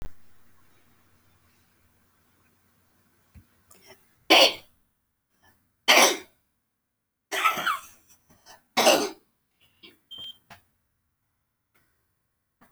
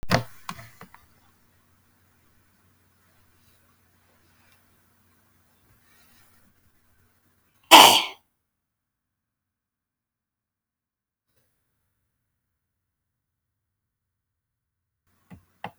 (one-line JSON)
{"three_cough_length": "12.7 s", "three_cough_amplitude": 22071, "three_cough_signal_mean_std_ratio": 0.25, "cough_length": "15.8 s", "cough_amplitude": 32768, "cough_signal_mean_std_ratio": 0.13, "survey_phase": "beta (2021-08-13 to 2022-03-07)", "age": "65+", "gender": "Female", "wearing_mask": "No", "symptom_none": true, "smoker_status": "Ex-smoker", "respiratory_condition_asthma": false, "respiratory_condition_other": false, "recruitment_source": "REACT", "submission_delay": "2 days", "covid_test_result": "Negative", "covid_test_method": "RT-qPCR"}